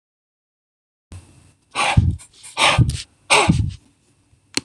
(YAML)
exhalation_length: 4.6 s
exhalation_amplitude: 26028
exhalation_signal_mean_std_ratio: 0.41
survey_phase: beta (2021-08-13 to 2022-03-07)
age: 18-44
gender: Male
wearing_mask: 'No'
symptom_runny_or_blocked_nose: true
symptom_headache: true
smoker_status: Never smoked
respiratory_condition_asthma: false
respiratory_condition_other: false
recruitment_source: REACT
submission_delay: 2 days
covid_test_result: Negative
covid_test_method: RT-qPCR
influenza_a_test_result: Negative
influenza_b_test_result: Negative